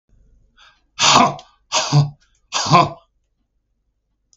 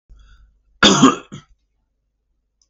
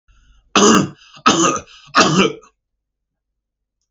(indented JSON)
{
  "exhalation_length": "4.4 s",
  "exhalation_amplitude": 32768,
  "exhalation_signal_mean_std_ratio": 0.38,
  "cough_length": "2.7 s",
  "cough_amplitude": 32768,
  "cough_signal_mean_std_ratio": 0.28,
  "three_cough_length": "3.9 s",
  "three_cough_amplitude": 32768,
  "three_cough_signal_mean_std_ratio": 0.42,
  "survey_phase": "beta (2021-08-13 to 2022-03-07)",
  "age": "45-64",
  "gender": "Male",
  "wearing_mask": "No",
  "symptom_none": true,
  "smoker_status": "Never smoked",
  "respiratory_condition_asthma": false,
  "respiratory_condition_other": false,
  "recruitment_source": "REACT",
  "submission_delay": "4 days",
  "covid_test_result": "Negative",
  "covid_test_method": "RT-qPCR",
  "influenza_a_test_result": "Negative",
  "influenza_b_test_result": "Negative"
}